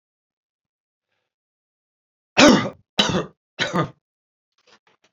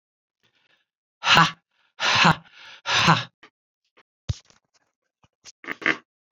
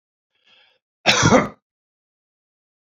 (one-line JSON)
{"three_cough_length": "5.1 s", "three_cough_amplitude": 30204, "three_cough_signal_mean_std_ratio": 0.27, "exhalation_length": "6.3 s", "exhalation_amplitude": 27436, "exhalation_signal_mean_std_ratio": 0.32, "cough_length": "2.9 s", "cough_amplitude": 32767, "cough_signal_mean_std_ratio": 0.29, "survey_phase": "alpha (2021-03-01 to 2021-08-12)", "age": "65+", "gender": "Male", "wearing_mask": "No", "symptom_cough_any": true, "symptom_headache": true, "smoker_status": "Ex-smoker", "respiratory_condition_asthma": false, "respiratory_condition_other": false, "recruitment_source": "Test and Trace", "submission_delay": "4 days", "covid_test_result": "Positive", "covid_test_method": "RT-qPCR", "covid_ct_value": 17.1, "covid_ct_gene": "N gene", "covid_ct_mean": 17.6, "covid_viral_load": "1700000 copies/ml", "covid_viral_load_category": "High viral load (>1M copies/ml)"}